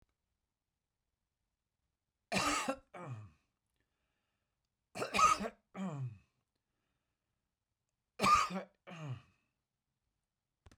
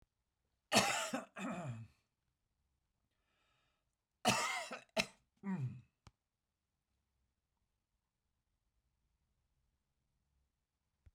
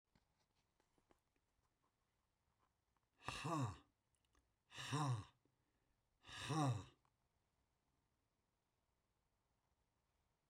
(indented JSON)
{
  "three_cough_length": "10.8 s",
  "three_cough_amplitude": 4680,
  "three_cough_signal_mean_std_ratio": 0.3,
  "cough_length": "11.1 s",
  "cough_amplitude": 5235,
  "cough_signal_mean_std_ratio": 0.29,
  "exhalation_length": "10.5 s",
  "exhalation_amplitude": 1118,
  "exhalation_signal_mean_std_ratio": 0.3,
  "survey_phase": "beta (2021-08-13 to 2022-03-07)",
  "age": "65+",
  "gender": "Male",
  "wearing_mask": "No",
  "symptom_none": true,
  "smoker_status": "Ex-smoker",
  "respiratory_condition_asthma": false,
  "respiratory_condition_other": false,
  "recruitment_source": "REACT",
  "submission_delay": "3 days",
  "covid_test_result": "Negative",
  "covid_test_method": "RT-qPCR",
  "influenza_a_test_result": "Negative",
  "influenza_b_test_result": "Negative"
}